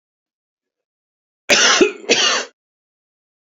cough_length: 3.5 s
cough_amplitude: 30153
cough_signal_mean_std_ratio: 0.38
survey_phase: beta (2021-08-13 to 2022-03-07)
age: 65+
gender: Male
wearing_mask: 'No'
symptom_none: true
smoker_status: Ex-smoker
respiratory_condition_asthma: false
respiratory_condition_other: false
recruitment_source: REACT
submission_delay: 7 days
covid_test_result: Negative
covid_test_method: RT-qPCR
influenza_a_test_result: Negative
influenza_b_test_result: Negative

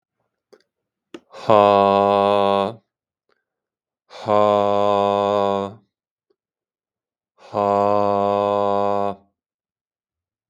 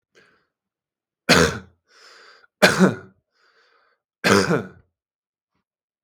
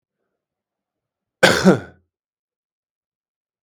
exhalation_length: 10.5 s
exhalation_amplitude: 32767
exhalation_signal_mean_std_ratio: 0.44
three_cough_length: 6.0 s
three_cough_amplitude: 32768
three_cough_signal_mean_std_ratio: 0.3
cough_length: 3.6 s
cough_amplitude: 32768
cough_signal_mean_std_ratio: 0.22
survey_phase: beta (2021-08-13 to 2022-03-07)
age: 18-44
gender: Male
wearing_mask: 'No'
symptom_abdominal_pain: true
symptom_fatigue: true
symptom_change_to_sense_of_smell_or_taste: true
smoker_status: Ex-smoker
respiratory_condition_asthma: false
respiratory_condition_other: false
recruitment_source: Test and Trace
submission_delay: 2 days
covid_test_result: Positive
covid_test_method: RT-qPCR
covid_ct_value: 35.2
covid_ct_gene: N gene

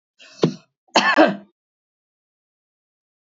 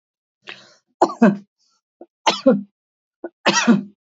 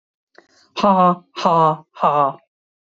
cough_length: 3.2 s
cough_amplitude: 29478
cough_signal_mean_std_ratio: 0.29
three_cough_length: 4.2 s
three_cough_amplitude: 28203
three_cough_signal_mean_std_ratio: 0.35
exhalation_length: 3.0 s
exhalation_amplitude: 27188
exhalation_signal_mean_std_ratio: 0.48
survey_phase: beta (2021-08-13 to 2022-03-07)
age: 65+
gender: Female
wearing_mask: 'No'
symptom_runny_or_blocked_nose: true
smoker_status: Never smoked
respiratory_condition_asthma: true
respiratory_condition_other: false
recruitment_source: REACT
submission_delay: 2 days
covid_test_result: Negative
covid_test_method: RT-qPCR
influenza_a_test_result: Negative
influenza_b_test_result: Negative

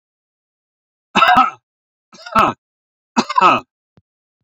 three_cough_length: 4.4 s
three_cough_amplitude: 29491
three_cough_signal_mean_std_ratio: 0.35
survey_phase: beta (2021-08-13 to 2022-03-07)
age: 65+
gender: Male
wearing_mask: 'No'
symptom_none: true
smoker_status: Ex-smoker
respiratory_condition_asthma: false
respiratory_condition_other: false
recruitment_source: REACT
submission_delay: 1 day
covid_test_result: Negative
covid_test_method: RT-qPCR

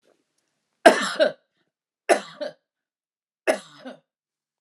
three_cough_length: 4.6 s
three_cough_amplitude: 29204
three_cough_signal_mean_std_ratio: 0.25
survey_phase: alpha (2021-03-01 to 2021-08-12)
age: 45-64
gender: Female
wearing_mask: 'No'
symptom_shortness_of_breath: true
symptom_fatigue: true
symptom_onset: 13 days
smoker_status: Ex-smoker
respiratory_condition_asthma: false
respiratory_condition_other: true
recruitment_source: REACT
submission_delay: 2 days
covid_test_result: Negative
covid_test_method: RT-qPCR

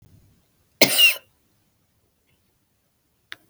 cough_length: 3.5 s
cough_amplitude: 32768
cough_signal_mean_std_ratio: 0.23
survey_phase: beta (2021-08-13 to 2022-03-07)
age: 45-64
gender: Female
wearing_mask: 'No'
symptom_cough_any: true
symptom_runny_or_blocked_nose: true
symptom_sore_throat: true
symptom_other: true
symptom_onset: 4 days
smoker_status: Never smoked
respiratory_condition_asthma: false
respiratory_condition_other: false
recruitment_source: Test and Trace
submission_delay: 1 day
covid_test_result: Positive
covid_test_method: RT-qPCR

